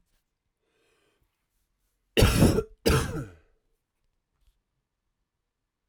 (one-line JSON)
{"cough_length": "5.9 s", "cough_amplitude": 15037, "cough_signal_mean_std_ratio": 0.28, "survey_phase": "alpha (2021-03-01 to 2021-08-12)", "age": "18-44", "gender": "Male", "wearing_mask": "No", "symptom_cough_any": true, "smoker_status": "Ex-smoker", "respiratory_condition_asthma": false, "respiratory_condition_other": false, "recruitment_source": "Test and Trace", "submission_delay": "1 day", "covid_test_result": "Positive", "covid_test_method": "RT-qPCR", "covid_ct_value": 19.0, "covid_ct_gene": "ORF1ab gene", "covid_ct_mean": 19.9, "covid_viral_load": "300000 copies/ml", "covid_viral_load_category": "Low viral load (10K-1M copies/ml)"}